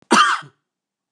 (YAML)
cough_length: 1.1 s
cough_amplitude: 29849
cough_signal_mean_std_ratio: 0.41
survey_phase: beta (2021-08-13 to 2022-03-07)
age: 45-64
gender: Male
wearing_mask: 'No'
symptom_none: true
smoker_status: Never smoked
respiratory_condition_asthma: false
respiratory_condition_other: false
recruitment_source: REACT
submission_delay: 2 days
covid_test_result: Negative
covid_test_method: RT-qPCR
influenza_a_test_result: Negative
influenza_b_test_result: Negative